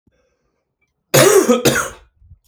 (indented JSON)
{
  "cough_length": "2.5 s",
  "cough_amplitude": 32768,
  "cough_signal_mean_std_ratio": 0.43,
  "survey_phase": "beta (2021-08-13 to 2022-03-07)",
  "age": "45-64",
  "gender": "Male",
  "wearing_mask": "No",
  "symptom_cough_any": true,
  "symptom_runny_or_blocked_nose": true,
  "symptom_shortness_of_breath": true,
  "symptom_sore_throat": true,
  "symptom_fatigue": true,
  "symptom_fever_high_temperature": true,
  "symptom_headache": true,
  "symptom_onset": "3 days",
  "smoker_status": "Ex-smoker",
  "respiratory_condition_asthma": false,
  "respiratory_condition_other": false,
  "recruitment_source": "Test and Trace",
  "submission_delay": "1 day",
  "covid_test_result": "Positive",
  "covid_test_method": "RT-qPCR"
}